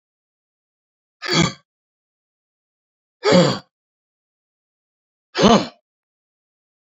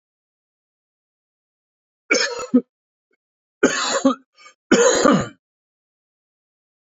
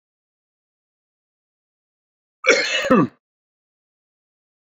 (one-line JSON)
{"exhalation_length": "6.8 s", "exhalation_amplitude": 29667, "exhalation_signal_mean_std_ratio": 0.26, "three_cough_length": "7.0 s", "three_cough_amplitude": 28334, "three_cough_signal_mean_std_ratio": 0.34, "cough_length": "4.7 s", "cough_amplitude": 27437, "cough_signal_mean_std_ratio": 0.26, "survey_phase": "beta (2021-08-13 to 2022-03-07)", "age": "65+", "gender": "Male", "wearing_mask": "No", "symptom_none": true, "smoker_status": "Ex-smoker", "respiratory_condition_asthma": false, "respiratory_condition_other": false, "recruitment_source": "REACT", "submission_delay": "12 days", "covid_test_result": "Negative", "covid_test_method": "RT-qPCR", "influenza_a_test_result": "Negative", "influenza_b_test_result": "Negative"}